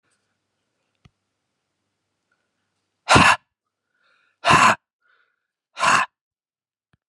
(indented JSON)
{
  "exhalation_length": "7.1 s",
  "exhalation_amplitude": 29725,
  "exhalation_signal_mean_std_ratio": 0.26,
  "survey_phase": "beta (2021-08-13 to 2022-03-07)",
  "age": "45-64",
  "gender": "Male",
  "wearing_mask": "No",
  "symptom_cough_any": true,
  "smoker_status": "Never smoked",
  "respiratory_condition_asthma": false,
  "respiratory_condition_other": false,
  "recruitment_source": "REACT",
  "submission_delay": "1 day",
  "covid_test_result": "Negative",
  "covid_test_method": "RT-qPCR"
}